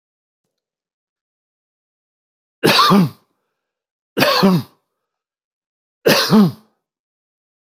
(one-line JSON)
{"three_cough_length": "7.7 s", "three_cough_amplitude": 30104, "three_cough_signal_mean_std_ratio": 0.35, "survey_phase": "beta (2021-08-13 to 2022-03-07)", "age": "65+", "gender": "Male", "wearing_mask": "No", "symptom_none": true, "symptom_onset": "13 days", "smoker_status": "Never smoked", "respiratory_condition_asthma": false, "respiratory_condition_other": false, "recruitment_source": "REACT", "submission_delay": "1 day", "covid_test_result": "Negative", "covid_test_method": "RT-qPCR", "influenza_a_test_result": "Unknown/Void", "influenza_b_test_result": "Unknown/Void"}